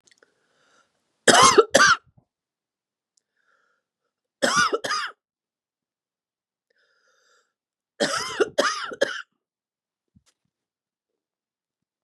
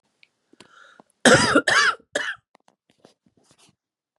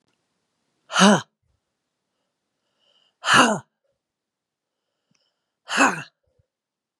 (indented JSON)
{
  "three_cough_length": "12.0 s",
  "three_cough_amplitude": 32738,
  "three_cough_signal_mean_std_ratio": 0.27,
  "cough_length": "4.2 s",
  "cough_amplitude": 31882,
  "cough_signal_mean_std_ratio": 0.33,
  "exhalation_length": "7.0 s",
  "exhalation_amplitude": 31584,
  "exhalation_signal_mean_std_ratio": 0.26,
  "survey_phase": "beta (2021-08-13 to 2022-03-07)",
  "age": "65+",
  "gender": "Female",
  "wearing_mask": "No",
  "symptom_cough_any": true,
  "symptom_new_continuous_cough": true,
  "symptom_runny_or_blocked_nose": true,
  "symptom_shortness_of_breath": true,
  "symptom_sore_throat": true,
  "symptom_abdominal_pain": true,
  "symptom_diarrhoea": true,
  "symptom_fatigue": true,
  "symptom_onset": "7 days",
  "smoker_status": "Ex-smoker",
  "respiratory_condition_asthma": false,
  "respiratory_condition_other": false,
  "recruitment_source": "Test and Trace",
  "submission_delay": "2 days",
  "covid_test_result": "Positive",
  "covid_test_method": "ePCR"
}